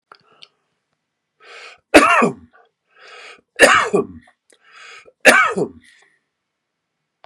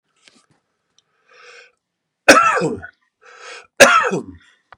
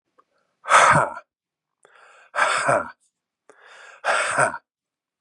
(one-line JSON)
{"three_cough_length": "7.3 s", "three_cough_amplitude": 32768, "three_cough_signal_mean_std_ratio": 0.31, "cough_length": "4.8 s", "cough_amplitude": 32768, "cough_signal_mean_std_ratio": 0.32, "exhalation_length": "5.2 s", "exhalation_amplitude": 27285, "exhalation_signal_mean_std_ratio": 0.4, "survey_phase": "beta (2021-08-13 to 2022-03-07)", "age": "45-64", "gender": "Male", "wearing_mask": "No", "symptom_cough_any": true, "symptom_runny_or_blocked_nose": true, "smoker_status": "Ex-smoker", "respiratory_condition_asthma": false, "respiratory_condition_other": false, "recruitment_source": "Test and Trace", "submission_delay": "1 day", "covid_test_result": "Positive", "covid_test_method": "RT-qPCR", "covid_ct_value": 24.2, "covid_ct_gene": "ORF1ab gene", "covid_ct_mean": 24.9, "covid_viral_load": "6600 copies/ml", "covid_viral_load_category": "Minimal viral load (< 10K copies/ml)"}